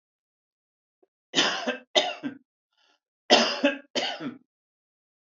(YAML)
three_cough_length: 5.2 s
three_cough_amplitude: 26447
three_cough_signal_mean_std_ratio: 0.36
survey_phase: alpha (2021-03-01 to 2021-08-12)
age: 65+
gender: Male
wearing_mask: 'No'
symptom_none: true
smoker_status: Never smoked
respiratory_condition_asthma: false
respiratory_condition_other: false
recruitment_source: REACT
submission_delay: 1 day
covid_test_result: Negative
covid_test_method: RT-qPCR